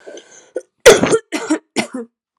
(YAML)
cough_length: 2.4 s
cough_amplitude: 32768
cough_signal_mean_std_ratio: 0.37
survey_phase: alpha (2021-03-01 to 2021-08-12)
age: 18-44
gender: Female
wearing_mask: 'No'
symptom_cough_any: true
symptom_new_continuous_cough: true
symptom_fatigue: true
symptom_fever_high_temperature: true
symptom_headache: true
symptom_change_to_sense_of_smell_or_taste: true
symptom_loss_of_taste: true
symptom_onset: 3 days
smoker_status: Never smoked
respiratory_condition_asthma: false
respiratory_condition_other: false
recruitment_source: Test and Trace
submission_delay: 2 days
covid_test_result: Positive
covid_test_method: RT-qPCR